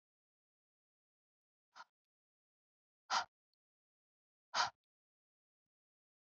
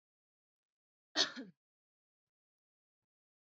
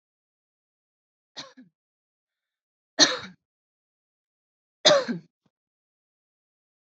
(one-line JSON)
{"exhalation_length": "6.4 s", "exhalation_amplitude": 2790, "exhalation_signal_mean_std_ratio": 0.16, "cough_length": "3.5 s", "cough_amplitude": 4875, "cough_signal_mean_std_ratio": 0.17, "three_cough_length": "6.8 s", "three_cough_amplitude": 25939, "three_cough_signal_mean_std_ratio": 0.19, "survey_phase": "beta (2021-08-13 to 2022-03-07)", "age": "18-44", "gender": "Female", "wearing_mask": "No", "symptom_none": true, "smoker_status": "Never smoked", "respiratory_condition_asthma": false, "respiratory_condition_other": false, "recruitment_source": "REACT", "submission_delay": "3 days", "covid_test_result": "Negative", "covid_test_method": "RT-qPCR", "influenza_a_test_result": "Negative", "influenza_b_test_result": "Negative"}